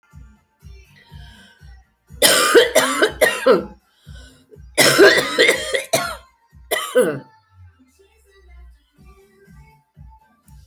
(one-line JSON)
{"three_cough_length": "10.7 s", "three_cough_amplitude": 32768, "three_cough_signal_mean_std_ratio": 0.41, "survey_phase": "beta (2021-08-13 to 2022-03-07)", "age": "65+", "gender": "Female", "wearing_mask": "No", "symptom_cough_any": true, "symptom_runny_or_blocked_nose": true, "symptom_sore_throat": true, "symptom_onset": "10 days", "smoker_status": "Never smoked", "respiratory_condition_asthma": false, "respiratory_condition_other": false, "recruitment_source": "REACT", "submission_delay": "2 days", "covid_test_result": "Negative", "covid_test_method": "RT-qPCR"}